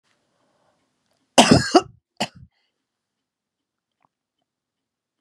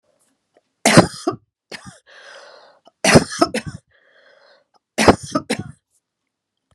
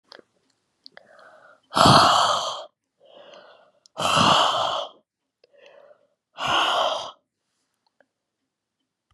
{"cough_length": "5.2 s", "cough_amplitude": 32768, "cough_signal_mean_std_ratio": 0.2, "three_cough_length": "6.7 s", "three_cough_amplitude": 32768, "three_cough_signal_mean_std_ratio": 0.28, "exhalation_length": "9.1 s", "exhalation_amplitude": 32281, "exhalation_signal_mean_std_ratio": 0.39, "survey_phase": "beta (2021-08-13 to 2022-03-07)", "age": "65+", "gender": "Female", "wearing_mask": "No", "symptom_none": true, "smoker_status": "Never smoked", "respiratory_condition_asthma": false, "respiratory_condition_other": false, "recruitment_source": "REACT", "submission_delay": "6 days", "covid_test_result": "Negative", "covid_test_method": "RT-qPCR", "influenza_a_test_result": "Negative", "influenza_b_test_result": "Negative"}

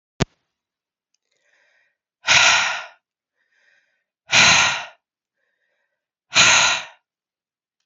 {"exhalation_length": "7.9 s", "exhalation_amplitude": 30885, "exhalation_signal_mean_std_ratio": 0.35, "survey_phase": "beta (2021-08-13 to 2022-03-07)", "age": "18-44", "gender": "Female", "wearing_mask": "No", "symptom_sore_throat": true, "symptom_fatigue": true, "smoker_status": "Never smoked", "respiratory_condition_asthma": false, "respiratory_condition_other": false, "recruitment_source": "Test and Trace", "submission_delay": "2 days", "covid_test_result": "Positive", "covid_test_method": "RT-qPCR", "covid_ct_value": 27.7, "covid_ct_gene": "N gene"}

